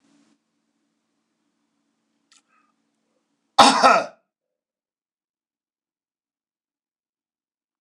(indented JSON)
{
  "cough_length": "7.8 s",
  "cough_amplitude": 26028,
  "cough_signal_mean_std_ratio": 0.18,
  "survey_phase": "beta (2021-08-13 to 2022-03-07)",
  "age": "65+",
  "gender": "Male",
  "wearing_mask": "No",
  "symptom_cough_any": true,
  "symptom_runny_or_blocked_nose": true,
  "smoker_status": "Never smoked",
  "respiratory_condition_asthma": false,
  "respiratory_condition_other": false,
  "recruitment_source": "REACT",
  "submission_delay": "0 days",
  "covid_test_result": "Negative",
  "covid_test_method": "RT-qPCR",
  "influenza_a_test_result": "Negative",
  "influenza_b_test_result": "Negative"
}